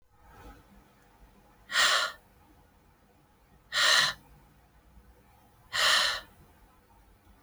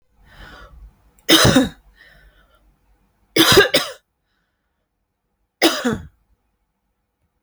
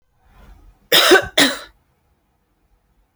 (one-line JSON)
{"exhalation_length": "7.4 s", "exhalation_amplitude": 10018, "exhalation_signal_mean_std_ratio": 0.36, "three_cough_length": "7.4 s", "three_cough_amplitude": 32767, "three_cough_signal_mean_std_ratio": 0.31, "cough_length": "3.2 s", "cough_amplitude": 32768, "cough_signal_mean_std_ratio": 0.32, "survey_phase": "beta (2021-08-13 to 2022-03-07)", "age": "18-44", "gender": "Female", "wearing_mask": "No", "symptom_runny_or_blocked_nose": true, "smoker_status": "Ex-smoker", "respiratory_condition_asthma": false, "respiratory_condition_other": false, "recruitment_source": "REACT", "submission_delay": "1 day", "covid_test_result": "Negative", "covid_test_method": "RT-qPCR"}